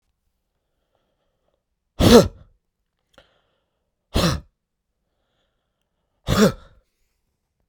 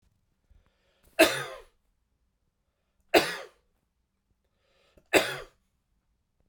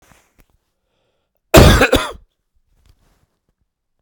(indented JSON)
{
  "exhalation_length": "7.7 s",
  "exhalation_amplitude": 32768,
  "exhalation_signal_mean_std_ratio": 0.22,
  "three_cough_length": "6.5 s",
  "three_cough_amplitude": 20954,
  "three_cough_signal_mean_std_ratio": 0.22,
  "cough_length": "4.0 s",
  "cough_amplitude": 32768,
  "cough_signal_mean_std_ratio": 0.27,
  "survey_phase": "beta (2021-08-13 to 2022-03-07)",
  "age": "45-64",
  "gender": "Male",
  "wearing_mask": "No",
  "symptom_cough_any": true,
  "symptom_fatigue": true,
  "symptom_onset": "3 days",
  "smoker_status": "Never smoked",
  "respiratory_condition_asthma": false,
  "respiratory_condition_other": false,
  "recruitment_source": "Test and Trace",
  "submission_delay": "1 day",
  "covid_test_result": "Positive",
  "covid_test_method": "RT-qPCR"
}